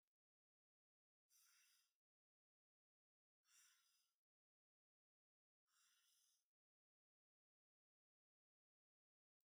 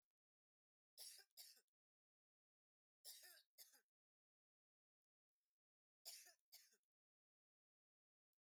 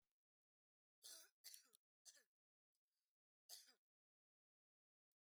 {"exhalation_length": "9.5 s", "exhalation_amplitude": 27, "exhalation_signal_mean_std_ratio": 0.32, "three_cough_length": "8.4 s", "three_cough_amplitude": 210, "three_cough_signal_mean_std_ratio": 0.3, "cough_length": "5.2 s", "cough_amplitude": 411, "cough_signal_mean_std_ratio": 0.28, "survey_phase": "beta (2021-08-13 to 2022-03-07)", "age": "45-64", "gender": "Female", "wearing_mask": "No", "symptom_none": true, "smoker_status": "Never smoked", "respiratory_condition_asthma": false, "respiratory_condition_other": false, "recruitment_source": "REACT", "submission_delay": "4 days", "covid_test_result": "Negative", "covid_test_method": "RT-qPCR", "influenza_a_test_result": "Negative", "influenza_b_test_result": "Negative"}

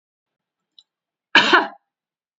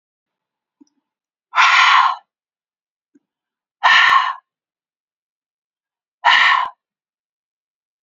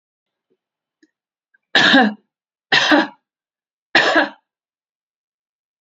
{"cough_length": "2.4 s", "cough_amplitude": 29064, "cough_signal_mean_std_ratio": 0.27, "exhalation_length": "8.0 s", "exhalation_amplitude": 32768, "exhalation_signal_mean_std_ratio": 0.36, "three_cough_length": "5.8 s", "three_cough_amplitude": 28221, "three_cough_signal_mean_std_ratio": 0.34, "survey_phase": "beta (2021-08-13 to 2022-03-07)", "age": "45-64", "gender": "Female", "wearing_mask": "No", "symptom_none": true, "smoker_status": "Never smoked", "respiratory_condition_asthma": false, "respiratory_condition_other": false, "recruitment_source": "REACT", "submission_delay": "1 day", "covid_test_result": "Negative", "covid_test_method": "RT-qPCR"}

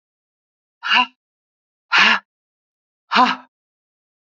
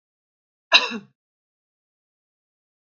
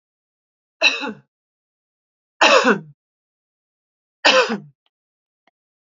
{"exhalation_length": "4.4 s", "exhalation_amplitude": 30865, "exhalation_signal_mean_std_ratio": 0.31, "cough_length": "2.9 s", "cough_amplitude": 30917, "cough_signal_mean_std_ratio": 0.17, "three_cough_length": "5.9 s", "three_cough_amplitude": 31004, "three_cough_signal_mean_std_ratio": 0.3, "survey_phase": "beta (2021-08-13 to 2022-03-07)", "age": "45-64", "gender": "Female", "wearing_mask": "No", "symptom_none": true, "symptom_onset": "12 days", "smoker_status": "Never smoked", "respiratory_condition_asthma": false, "respiratory_condition_other": false, "recruitment_source": "REACT", "submission_delay": "1 day", "covid_test_result": "Negative", "covid_test_method": "RT-qPCR", "influenza_a_test_result": "Negative", "influenza_b_test_result": "Negative"}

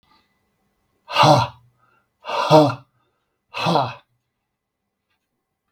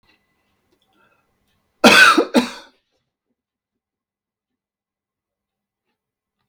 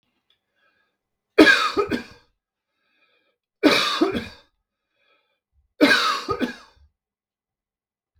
{"exhalation_length": "5.7 s", "exhalation_amplitude": 32766, "exhalation_signal_mean_std_ratio": 0.33, "cough_length": "6.5 s", "cough_amplitude": 32768, "cough_signal_mean_std_ratio": 0.22, "three_cough_length": "8.2 s", "three_cough_amplitude": 32766, "three_cough_signal_mean_std_ratio": 0.33, "survey_phase": "beta (2021-08-13 to 2022-03-07)", "age": "45-64", "gender": "Male", "wearing_mask": "No", "symptom_none": true, "smoker_status": "Never smoked", "respiratory_condition_asthma": false, "respiratory_condition_other": false, "recruitment_source": "REACT", "submission_delay": "0 days", "covid_test_result": "Negative", "covid_test_method": "RT-qPCR"}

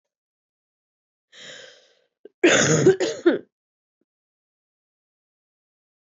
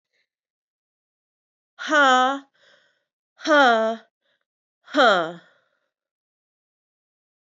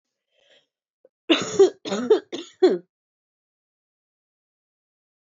{"cough_length": "6.1 s", "cough_amplitude": 17809, "cough_signal_mean_std_ratio": 0.29, "exhalation_length": "7.4 s", "exhalation_amplitude": 18812, "exhalation_signal_mean_std_ratio": 0.32, "three_cough_length": "5.2 s", "three_cough_amplitude": 19602, "three_cough_signal_mean_std_ratio": 0.28, "survey_phase": "beta (2021-08-13 to 2022-03-07)", "age": "18-44", "gender": "Female", "wearing_mask": "No", "symptom_cough_any": true, "symptom_new_continuous_cough": true, "symptom_runny_or_blocked_nose": true, "symptom_shortness_of_breath": true, "symptom_sore_throat": true, "symptom_fatigue": true, "symptom_headache": true, "symptom_change_to_sense_of_smell_or_taste": true, "symptom_loss_of_taste": true, "symptom_onset": "3 days", "smoker_status": "Current smoker (1 to 10 cigarettes per day)", "respiratory_condition_asthma": false, "respiratory_condition_other": false, "recruitment_source": "Test and Trace", "submission_delay": "2 days", "covid_test_result": "Positive", "covid_test_method": "RT-qPCR", "covid_ct_value": 20.5, "covid_ct_gene": "ORF1ab gene"}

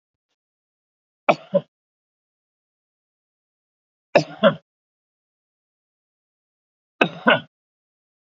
{"three_cough_length": "8.4 s", "three_cough_amplitude": 32767, "three_cough_signal_mean_std_ratio": 0.18, "survey_phase": "beta (2021-08-13 to 2022-03-07)", "age": "45-64", "gender": "Male", "wearing_mask": "No", "symptom_cough_any": true, "symptom_runny_or_blocked_nose": true, "symptom_fatigue": true, "smoker_status": "Never smoked", "respiratory_condition_asthma": false, "respiratory_condition_other": false, "recruitment_source": "Test and Trace", "submission_delay": "2 days", "covid_test_result": "Positive", "covid_test_method": "RT-qPCR", "covid_ct_value": 22.1, "covid_ct_gene": "ORF1ab gene"}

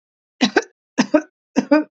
{"three_cough_length": "2.0 s", "three_cough_amplitude": 26792, "three_cough_signal_mean_std_ratio": 0.38, "survey_phase": "beta (2021-08-13 to 2022-03-07)", "age": "18-44", "gender": "Female", "wearing_mask": "No", "symptom_none": true, "smoker_status": "Never smoked", "respiratory_condition_asthma": false, "respiratory_condition_other": false, "recruitment_source": "REACT", "submission_delay": "4 days", "covid_test_result": "Negative", "covid_test_method": "RT-qPCR", "influenza_a_test_result": "Negative", "influenza_b_test_result": "Negative"}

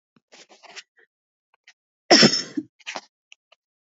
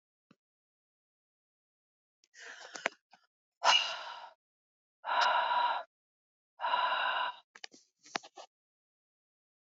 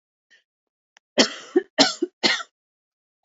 {"cough_length": "3.9 s", "cough_amplitude": 32282, "cough_signal_mean_std_ratio": 0.23, "exhalation_length": "9.6 s", "exhalation_amplitude": 10266, "exhalation_signal_mean_std_ratio": 0.37, "three_cough_length": "3.2 s", "three_cough_amplitude": 28958, "three_cough_signal_mean_std_ratio": 0.3, "survey_phase": "alpha (2021-03-01 to 2021-08-12)", "age": "18-44", "gender": "Female", "wearing_mask": "No", "symptom_cough_any": true, "symptom_fatigue": true, "symptom_headache": true, "symptom_onset": "6 days", "smoker_status": "Never smoked", "respiratory_condition_asthma": false, "respiratory_condition_other": false, "recruitment_source": "Test and Trace", "submission_delay": "1 day", "covid_test_result": "Positive", "covid_test_method": "RT-qPCR", "covid_ct_value": 25.8, "covid_ct_gene": "ORF1ab gene", "covid_ct_mean": 27.0, "covid_viral_load": "1400 copies/ml", "covid_viral_load_category": "Minimal viral load (< 10K copies/ml)"}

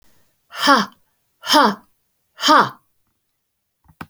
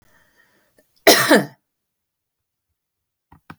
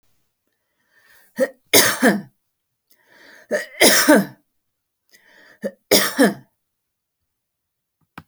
{"exhalation_length": "4.1 s", "exhalation_amplitude": 30964, "exhalation_signal_mean_std_ratio": 0.34, "cough_length": "3.6 s", "cough_amplitude": 32767, "cough_signal_mean_std_ratio": 0.24, "three_cough_length": "8.3 s", "three_cough_amplitude": 32768, "three_cough_signal_mean_std_ratio": 0.33, "survey_phase": "alpha (2021-03-01 to 2021-08-12)", "age": "65+", "gender": "Female", "wearing_mask": "No", "symptom_none": true, "smoker_status": "Ex-smoker", "respiratory_condition_asthma": false, "respiratory_condition_other": false, "recruitment_source": "REACT", "submission_delay": "1 day", "covid_test_result": "Negative", "covid_test_method": "RT-qPCR"}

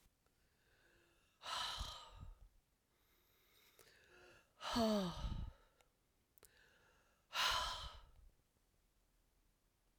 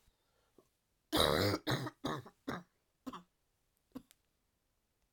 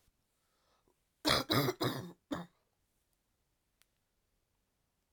{"exhalation_length": "10.0 s", "exhalation_amplitude": 1679, "exhalation_signal_mean_std_ratio": 0.37, "three_cough_length": "5.1 s", "three_cough_amplitude": 6132, "three_cough_signal_mean_std_ratio": 0.34, "cough_length": "5.1 s", "cough_amplitude": 8554, "cough_signal_mean_std_ratio": 0.29, "survey_phase": "alpha (2021-03-01 to 2021-08-12)", "age": "45-64", "gender": "Female", "wearing_mask": "No", "symptom_cough_any": true, "symptom_fatigue": true, "symptom_headache": true, "symptom_change_to_sense_of_smell_or_taste": true, "symptom_onset": "3 days", "smoker_status": "Never smoked", "respiratory_condition_asthma": true, "respiratory_condition_other": false, "recruitment_source": "Test and Trace", "submission_delay": "1 day", "covid_test_result": "Positive", "covid_test_method": "RT-qPCR", "covid_ct_value": 15.5, "covid_ct_gene": "ORF1ab gene", "covid_ct_mean": 15.9, "covid_viral_load": "6000000 copies/ml", "covid_viral_load_category": "High viral load (>1M copies/ml)"}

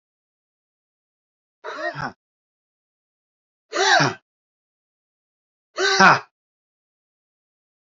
{"exhalation_length": "7.9 s", "exhalation_amplitude": 28534, "exhalation_signal_mean_std_ratio": 0.26, "survey_phase": "alpha (2021-03-01 to 2021-08-12)", "age": "45-64", "gender": "Male", "wearing_mask": "No", "symptom_cough_any": true, "symptom_headache": true, "symptom_change_to_sense_of_smell_or_taste": true, "symptom_loss_of_taste": true, "symptom_onset": "4 days", "smoker_status": "Never smoked", "respiratory_condition_asthma": false, "respiratory_condition_other": false, "recruitment_source": "Test and Trace", "submission_delay": "2 days", "covid_test_result": "Positive", "covid_test_method": "RT-qPCR", "covid_ct_value": 14.2, "covid_ct_gene": "ORF1ab gene", "covid_ct_mean": 14.9, "covid_viral_load": "13000000 copies/ml", "covid_viral_load_category": "High viral load (>1M copies/ml)"}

